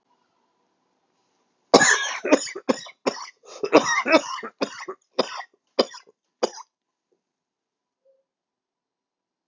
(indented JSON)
{
  "cough_length": "9.5 s",
  "cough_amplitude": 32768,
  "cough_signal_mean_std_ratio": 0.29,
  "survey_phase": "beta (2021-08-13 to 2022-03-07)",
  "age": "18-44",
  "gender": "Male",
  "wearing_mask": "No",
  "symptom_cough_any": true,
  "symptom_runny_or_blocked_nose": true,
  "symptom_diarrhoea": true,
  "symptom_fatigue": true,
  "symptom_fever_high_temperature": true,
  "symptom_headache": true,
  "symptom_change_to_sense_of_smell_or_taste": true,
  "symptom_loss_of_taste": true,
  "smoker_status": "Ex-smoker",
  "recruitment_source": "Test and Trace",
  "submission_delay": "2 days",
  "covid_test_result": "Positive",
  "covid_test_method": "RT-qPCR",
  "covid_ct_value": 21.2,
  "covid_ct_gene": "ORF1ab gene"
}